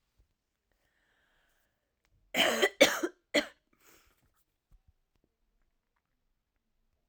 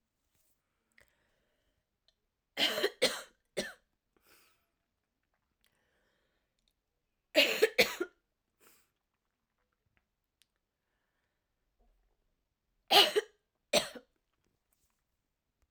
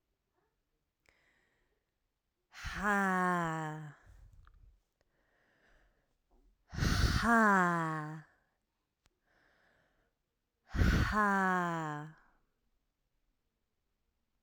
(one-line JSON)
{"cough_length": "7.1 s", "cough_amplitude": 13230, "cough_signal_mean_std_ratio": 0.22, "three_cough_length": "15.7 s", "three_cough_amplitude": 14760, "three_cough_signal_mean_std_ratio": 0.21, "exhalation_length": "14.4 s", "exhalation_amplitude": 4917, "exhalation_signal_mean_std_ratio": 0.42, "survey_phase": "alpha (2021-03-01 to 2021-08-12)", "age": "18-44", "gender": "Female", "wearing_mask": "No", "symptom_cough_any": true, "symptom_new_continuous_cough": true, "symptom_fatigue": true, "symptom_fever_high_temperature": true, "symptom_headache": true, "smoker_status": "Never smoked", "respiratory_condition_asthma": false, "respiratory_condition_other": false, "recruitment_source": "Test and Trace", "submission_delay": "2 days", "covid_test_result": "Positive", "covid_test_method": "RT-qPCR", "covid_ct_value": 27.6, "covid_ct_gene": "ORF1ab gene", "covid_ct_mean": 28.1, "covid_viral_load": "590 copies/ml", "covid_viral_load_category": "Minimal viral load (< 10K copies/ml)"}